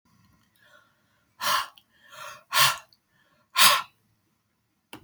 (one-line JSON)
{"exhalation_length": "5.0 s", "exhalation_amplitude": 30358, "exhalation_signal_mean_std_ratio": 0.29, "survey_phase": "beta (2021-08-13 to 2022-03-07)", "age": "65+", "gender": "Female", "wearing_mask": "No", "symptom_none": true, "smoker_status": "Ex-smoker", "respiratory_condition_asthma": true, "respiratory_condition_other": false, "recruitment_source": "REACT", "submission_delay": "3 days", "covid_test_result": "Negative", "covid_test_method": "RT-qPCR", "influenza_a_test_result": "Negative", "influenza_b_test_result": "Negative"}